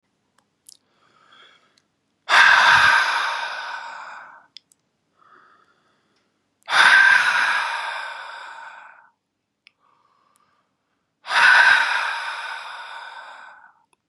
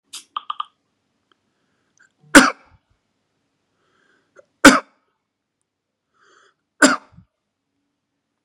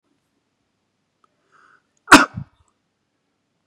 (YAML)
exhalation_length: 14.1 s
exhalation_amplitude: 29653
exhalation_signal_mean_std_ratio: 0.42
three_cough_length: 8.4 s
three_cough_amplitude: 32768
three_cough_signal_mean_std_ratio: 0.17
cough_length: 3.7 s
cough_amplitude: 32768
cough_signal_mean_std_ratio: 0.15
survey_phase: beta (2021-08-13 to 2022-03-07)
age: 18-44
gender: Male
wearing_mask: 'No'
symptom_none: true
smoker_status: Never smoked
respiratory_condition_asthma: true
respiratory_condition_other: false
recruitment_source: REACT
submission_delay: 1 day
covid_test_result: Negative
covid_test_method: RT-qPCR
influenza_a_test_result: Negative
influenza_b_test_result: Negative